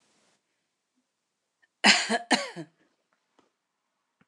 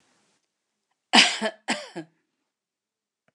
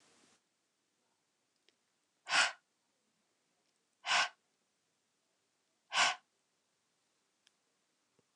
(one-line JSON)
{"cough_length": "4.3 s", "cough_amplitude": 19477, "cough_signal_mean_std_ratio": 0.24, "three_cough_length": "3.3 s", "three_cough_amplitude": 27439, "three_cough_signal_mean_std_ratio": 0.25, "exhalation_length": "8.4 s", "exhalation_amplitude": 5589, "exhalation_signal_mean_std_ratio": 0.22, "survey_phase": "beta (2021-08-13 to 2022-03-07)", "age": "45-64", "gender": "Female", "wearing_mask": "No", "symptom_none": true, "smoker_status": "Never smoked", "respiratory_condition_asthma": false, "respiratory_condition_other": false, "recruitment_source": "REACT", "submission_delay": "1 day", "covid_test_result": "Negative", "covid_test_method": "RT-qPCR", "influenza_a_test_result": "Unknown/Void", "influenza_b_test_result": "Unknown/Void"}